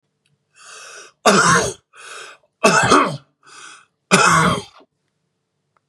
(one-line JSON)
{"three_cough_length": "5.9 s", "three_cough_amplitude": 32768, "three_cough_signal_mean_std_ratio": 0.43, "survey_phase": "beta (2021-08-13 to 2022-03-07)", "age": "45-64", "gender": "Male", "wearing_mask": "No", "symptom_diarrhoea": true, "symptom_headache": true, "symptom_change_to_sense_of_smell_or_taste": true, "smoker_status": "Never smoked", "respiratory_condition_asthma": true, "respiratory_condition_other": false, "recruitment_source": "Test and Trace", "submission_delay": "2 days", "covid_test_result": "Positive", "covid_test_method": "RT-qPCR", "covid_ct_value": 27.4, "covid_ct_gene": "ORF1ab gene", "covid_ct_mean": 28.4, "covid_viral_load": "470 copies/ml", "covid_viral_load_category": "Minimal viral load (< 10K copies/ml)"}